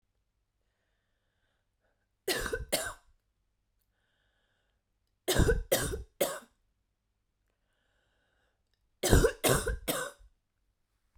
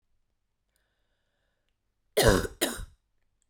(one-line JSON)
{"three_cough_length": "11.2 s", "three_cough_amplitude": 12982, "three_cough_signal_mean_std_ratio": 0.31, "cough_length": "3.5 s", "cough_amplitude": 15361, "cough_signal_mean_std_ratio": 0.26, "survey_phase": "beta (2021-08-13 to 2022-03-07)", "age": "45-64", "gender": "Female", "wearing_mask": "No", "symptom_cough_any": true, "symptom_runny_or_blocked_nose": true, "symptom_fatigue": true, "symptom_change_to_sense_of_smell_or_taste": true, "symptom_other": true, "symptom_onset": "4 days", "smoker_status": "Never smoked", "respiratory_condition_asthma": false, "respiratory_condition_other": false, "recruitment_source": "Test and Trace", "submission_delay": "2 days", "covid_test_result": "Positive", "covid_test_method": "RT-qPCR", "covid_ct_value": 19.7, "covid_ct_gene": "N gene", "covid_ct_mean": 20.0, "covid_viral_load": "280000 copies/ml", "covid_viral_load_category": "Low viral load (10K-1M copies/ml)"}